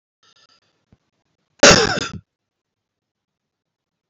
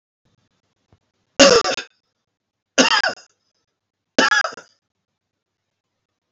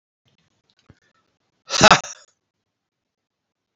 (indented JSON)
{
  "cough_length": "4.1 s",
  "cough_amplitude": 32768,
  "cough_signal_mean_std_ratio": 0.22,
  "three_cough_length": "6.3 s",
  "three_cough_amplitude": 32768,
  "three_cough_signal_mean_std_ratio": 0.28,
  "exhalation_length": "3.8 s",
  "exhalation_amplitude": 32768,
  "exhalation_signal_mean_std_ratio": 0.18,
  "survey_phase": "beta (2021-08-13 to 2022-03-07)",
  "age": "45-64",
  "gender": "Male",
  "wearing_mask": "No",
  "symptom_cough_any": true,
  "smoker_status": "Never smoked",
  "respiratory_condition_asthma": false,
  "respiratory_condition_other": false,
  "recruitment_source": "REACT",
  "submission_delay": "12 days",
  "covid_test_result": "Negative",
  "covid_test_method": "RT-qPCR"
}